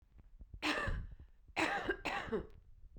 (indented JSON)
{
  "three_cough_length": "3.0 s",
  "three_cough_amplitude": 3021,
  "three_cough_signal_mean_std_ratio": 0.64,
  "survey_phase": "beta (2021-08-13 to 2022-03-07)",
  "age": "18-44",
  "gender": "Female",
  "wearing_mask": "No",
  "symptom_none": true,
  "smoker_status": "Ex-smoker",
  "respiratory_condition_asthma": true,
  "respiratory_condition_other": false,
  "recruitment_source": "REACT",
  "submission_delay": "1 day",
  "covid_test_result": "Negative",
  "covid_test_method": "RT-qPCR",
  "influenza_a_test_result": "Negative",
  "influenza_b_test_result": "Negative"
}